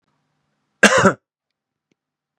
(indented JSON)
{
  "cough_length": "2.4 s",
  "cough_amplitude": 32768,
  "cough_signal_mean_std_ratio": 0.26,
  "survey_phase": "beta (2021-08-13 to 2022-03-07)",
  "age": "18-44",
  "gender": "Male",
  "wearing_mask": "No",
  "symptom_diarrhoea": true,
  "symptom_fatigue": true,
  "smoker_status": "Ex-smoker",
  "respiratory_condition_asthma": true,
  "respiratory_condition_other": false,
  "recruitment_source": "Test and Trace",
  "submission_delay": "5 days",
  "covid_test_result": "Negative",
  "covid_test_method": "LFT"
}